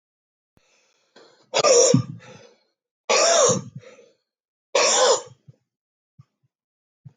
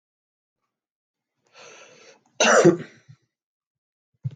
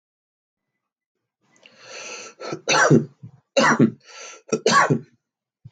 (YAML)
exhalation_length: 7.2 s
exhalation_amplitude: 20900
exhalation_signal_mean_std_ratio: 0.39
cough_length: 4.4 s
cough_amplitude: 24306
cough_signal_mean_std_ratio: 0.25
three_cough_length: 5.7 s
three_cough_amplitude: 21680
three_cough_signal_mean_std_ratio: 0.38
survey_phase: beta (2021-08-13 to 2022-03-07)
age: 45-64
gender: Male
wearing_mask: 'No'
symptom_none: true
smoker_status: Never smoked
respiratory_condition_asthma: false
respiratory_condition_other: false
recruitment_source: REACT
submission_delay: 1 day
covid_test_result: Negative
covid_test_method: RT-qPCR